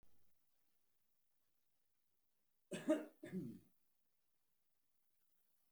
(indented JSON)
{
  "cough_length": "5.7 s",
  "cough_amplitude": 1909,
  "cough_signal_mean_std_ratio": 0.25,
  "survey_phase": "beta (2021-08-13 to 2022-03-07)",
  "age": "65+",
  "gender": "Male",
  "wearing_mask": "No",
  "symptom_none": true,
  "smoker_status": "Ex-smoker",
  "respiratory_condition_asthma": false,
  "respiratory_condition_other": false,
  "recruitment_source": "REACT",
  "submission_delay": "1 day",
  "covid_test_result": "Negative",
  "covid_test_method": "RT-qPCR"
}